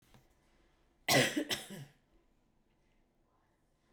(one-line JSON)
{"cough_length": "3.9 s", "cough_amplitude": 5675, "cough_signal_mean_std_ratio": 0.28, "survey_phase": "beta (2021-08-13 to 2022-03-07)", "age": "18-44", "gender": "Female", "wearing_mask": "No", "symptom_cough_any": true, "symptom_runny_or_blocked_nose": true, "symptom_sore_throat": true, "symptom_headache": true, "symptom_onset": "4 days", "smoker_status": "Ex-smoker", "respiratory_condition_asthma": false, "respiratory_condition_other": false, "recruitment_source": "Test and Trace", "submission_delay": "2 days", "covid_test_result": "Positive", "covid_test_method": "RT-qPCR", "covid_ct_value": 20.5, "covid_ct_gene": "N gene"}